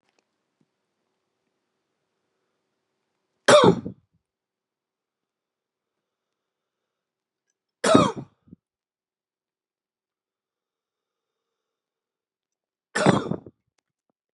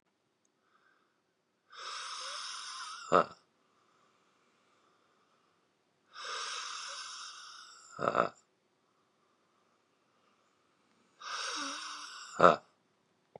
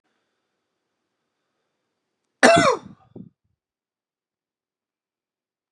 {
  "three_cough_length": "14.3 s",
  "three_cough_amplitude": 32635,
  "three_cough_signal_mean_std_ratio": 0.19,
  "exhalation_length": "13.4 s",
  "exhalation_amplitude": 15781,
  "exhalation_signal_mean_std_ratio": 0.27,
  "cough_length": "5.7 s",
  "cough_amplitude": 32768,
  "cough_signal_mean_std_ratio": 0.19,
  "survey_phase": "beta (2021-08-13 to 2022-03-07)",
  "age": "18-44",
  "gender": "Male",
  "wearing_mask": "No",
  "symptom_none": true,
  "smoker_status": "Current smoker (e-cigarettes or vapes only)",
  "respiratory_condition_asthma": false,
  "respiratory_condition_other": false,
  "recruitment_source": "REACT",
  "submission_delay": "1 day",
  "covid_test_result": "Negative",
  "covid_test_method": "RT-qPCR",
  "influenza_a_test_result": "Negative",
  "influenza_b_test_result": "Negative"
}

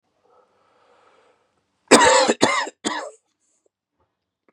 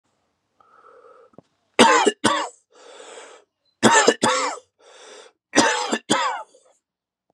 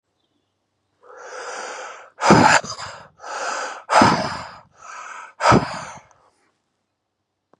{
  "cough_length": "4.5 s",
  "cough_amplitude": 32768,
  "cough_signal_mean_std_ratio": 0.31,
  "three_cough_length": "7.3 s",
  "three_cough_amplitude": 31952,
  "three_cough_signal_mean_std_ratio": 0.39,
  "exhalation_length": "7.6 s",
  "exhalation_amplitude": 32089,
  "exhalation_signal_mean_std_ratio": 0.38,
  "survey_phase": "beta (2021-08-13 to 2022-03-07)",
  "age": "45-64",
  "gender": "Male",
  "wearing_mask": "No",
  "symptom_cough_any": true,
  "symptom_shortness_of_breath": true,
  "symptom_onset": "3 days",
  "smoker_status": "Never smoked",
  "respiratory_condition_asthma": false,
  "respiratory_condition_other": false,
  "recruitment_source": "Test and Trace",
  "submission_delay": "1 day",
  "covid_test_result": "Positive",
  "covid_test_method": "RT-qPCR",
  "covid_ct_value": 20.7,
  "covid_ct_gene": "ORF1ab gene",
  "covid_ct_mean": 20.9,
  "covid_viral_load": "140000 copies/ml",
  "covid_viral_load_category": "Low viral load (10K-1M copies/ml)"
}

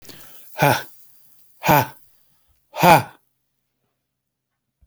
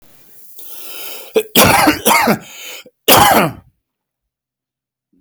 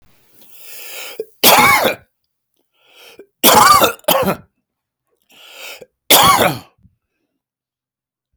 {
  "exhalation_length": "4.9 s",
  "exhalation_amplitude": 30557,
  "exhalation_signal_mean_std_ratio": 0.29,
  "cough_length": "5.2 s",
  "cough_amplitude": 32768,
  "cough_signal_mean_std_ratio": 0.46,
  "three_cough_length": "8.4 s",
  "three_cough_amplitude": 32768,
  "three_cough_signal_mean_std_ratio": 0.39,
  "survey_phase": "alpha (2021-03-01 to 2021-08-12)",
  "age": "45-64",
  "gender": "Male",
  "wearing_mask": "No",
  "symptom_none": true,
  "smoker_status": "Never smoked",
  "respiratory_condition_asthma": false,
  "respiratory_condition_other": false,
  "recruitment_source": "REACT",
  "submission_delay": "1 day",
  "covid_test_result": "Negative",
  "covid_test_method": "RT-qPCR"
}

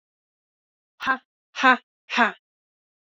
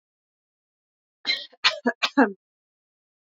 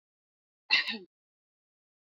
{
  "exhalation_length": "3.1 s",
  "exhalation_amplitude": 26654,
  "exhalation_signal_mean_std_ratio": 0.27,
  "three_cough_length": "3.3 s",
  "three_cough_amplitude": 19176,
  "three_cough_signal_mean_std_ratio": 0.27,
  "cough_length": "2.0 s",
  "cough_amplitude": 8842,
  "cough_signal_mean_std_ratio": 0.24,
  "survey_phase": "beta (2021-08-13 to 2022-03-07)",
  "age": "18-44",
  "gender": "Female",
  "wearing_mask": "No",
  "symptom_runny_or_blocked_nose": true,
  "symptom_sore_throat": true,
  "smoker_status": "Never smoked",
  "respiratory_condition_asthma": false,
  "respiratory_condition_other": false,
  "recruitment_source": "REACT",
  "submission_delay": "2 days",
  "covid_test_result": "Negative",
  "covid_test_method": "RT-qPCR"
}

